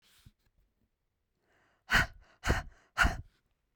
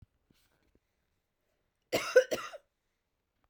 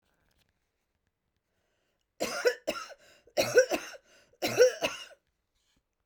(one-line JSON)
{"exhalation_length": "3.8 s", "exhalation_amplitude": 7415, "exhalation_signal_mean_std_ratio": 0.29, "cough_length": "3.5 s", "cough_amplitude": 10206, "cough_signal_mean_std_ratio": 0.21, "three_cough_length": "6.1 s", "three_cough_amplitude": 12322, "three_cough_signal_mean_std_ratio": 0.31, "survey_phase": "beta (2021-08-13 to 2022-03-07)", "age": "18-44", "gender": "Female", "wearing_mask": "No", "symptom_none": true, "smoker_status": "Never smoked", "respiratory_condition_asthma": false, "respiratory_condition_other": false, "recruitment_source": "REACT", "submission_delay": "3 days", "covid_test_result": "Negative", "covid_test_method": "RT-qPCR", "influenza_a_test_result": "Negative", "influenza_b_test_result": "Negative"}